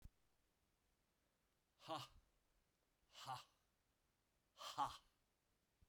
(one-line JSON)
{"exhalation_length": "5.9 s", "exhalation_amplitude": 802, "exhalation_signal_mean_std_ratio": 0.28, "survey_phase": "beta (2021-08-13 to 2022-03-07)", "age": "45-64", "gender": "Male", "wearing_mask": "No", "symptom_none": true, "symptom_onset": "4 days", "smoker_status": "Never smoked", "respiratory_condition_asthma": false, "respiratory_condition_other": false, "recruitment_source": "Test and Trace", "submission_delay": "1 day", "covid_test_result": "Positive", "covid_test_method": "RT-qPCR", "covid_ct_value": 18.0, "covid_ct_gene": "N gene"}